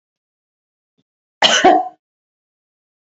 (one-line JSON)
{"cough_length": "3.1 s", "cough_amplitude": 32768, "cough_signal_mean_std_ratio": 0.29, "survey_phase": "beta (2021-08-13 to 2022-03-07)", "age": "18-44", "gender": "Female", "wearing_mask": "No", "symptom_none": true, "smoker_status": "Ex-smoker", "respiratory_condition_asthma": false, "respiratory_condition_other": false, "recruitment_source": "REACT", "submission_delay": "3 days", "covid_test_result": "Negative", "covid_test_method": "RT-qPCR", "influenza_a_test_result": "Unknown/Void", "influenza_b_test_result": "Unknown/Void"}